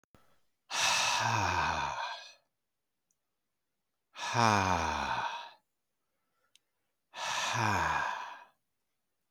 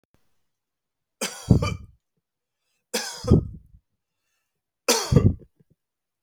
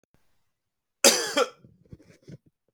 {
  "exhalation_length": "9.3 s",
  "exhalation_amplitude": 9953,
  "exhalation_signal_mean_std_ratio": 0.52,
  "three_cough_length": "6.2 s",
  "three_cough_amplitude": 30177,
  "three_cough_signal_mean_std_ratio": 0.29,
  "cough_length": "2.7 s",
  "cough_amplitude": 32345,
  "cough_signal_mean_std_ratio": 0.27,
  "survey_phase": "beta (2021-08-13 to 2022-03-07)",
  "age": "45-64",
  "gender": "Male",
  "wearing_mask": "No",
  "symptom_none": true,
  "smoker_status": "Never smoked",
  "respiratory_condition_asthma": false,
  "respiratory_condition_other": false,
  "recruitment_source": "REACT",
  "submission_delay": "17 days",
  "covid_test_result": "Negative",
  "covid_test_method": "RT-qPCR",
  "influenza_a_test_result": "Negative",
  "influenza_b_test_result": "Negative"
}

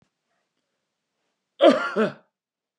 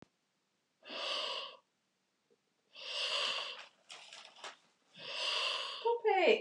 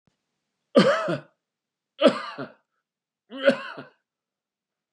{
  "cough_length": "2.8 s",
  "cough_amplitude": 23770,
  "cough_signal_mean_std_ratio": 0.28,
  "exhalation_length": "6.4 s",
  "exhalation_amplitude": 5811,
  "exhalation_signal_mean_std_ratio": 0.5,
  "three_cough_length": "4.9 s",
  "three_cough_amplitude": 24173,
  "three_cough_signal_mean_std_ratio": 0.3,
  "survey_phase": "beta (2021-08-13 to 2022-03-07)",
  "age": "45-64",
  "gender": "Male",
  "wearing_mask": "No",
  "symptom_none": true,
  "smoker_status": "Never smoked",
  "respiratory_condition_asthma": false,
  "respiratory_condition_other": false,
  "recruitment_source": "REACT",
  "submission_delay": "3 days",
  "covid_test_result": "Negative",
  "covid_test_method": "RT-qPCR",
  "influenza_a_test_result": "Negative",
  "influenza_b_test_result": "Negative"
}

